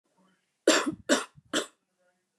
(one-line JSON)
{"three_cough_length": "2.4 s", "three_cough_amplitude": 14246, "three_cough_signal_mean_std_ratio": 0.33, "survey_phase": "beta (2021-08-13 to 2022-03-07)", "age": "18-44", "gender": "Female", "wearing_mask": "No", "symptom_none": true, "smoker_status": "Never smoked", "respiratory_condition_asthma": false, "respiratory_condition_other": false, "recruitment_source": "REACT", "submission_delay": "0 days", "covid_test_result": "Negative", "covid_test_method": "RT-qPCR", "influenza_a_test_result": "Negative", "influenza_b_test_result": "Negative"}